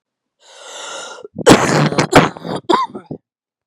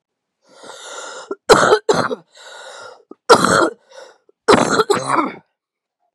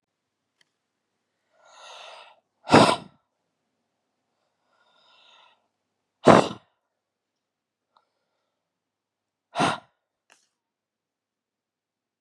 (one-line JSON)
{"cough_length": "3.7 s", "cough_amplitude": 32768, "cough_signal_mean_std_ratio": 0.43, "three_cough_length": "6.1 s", "three_cough_amplitude": 32768, "three_cough_signal_mean_std_ratio": 0.41, "exhalation_length": "12.2 s", "exhalation_amplitude": 32767, "exhalation_signal_mean_std_ratio": 0.17, "survey_phase": "beta (2021-08-13 to 2022-03-07)", "age": "18-44", "gender": "Female", "wearing_mask": "No", "symptom_cough_any": true, "symptom_runny_or_blocked_nose": true, "symptom_shortness_of_breath": true, "symptom_sore_throat": true, "symptom_abdominal_pain": true, "symptom_diarrhoea": true, "symptom_fatigue": true, "symptom_headache": true, "symptom_onset": "3 days", "smoker_status": "Never smoked", "respiratory_condition_asthma": false, "respiratory_condition_other": false, "recruitment_source": "Test and Trace", "submission_delay": "1 day", "covid_test_result": "Positive", "covid_test_method": "RT-qPCR", "covid_ct_value": 22.7, "covid_ct_gene": "N gene"}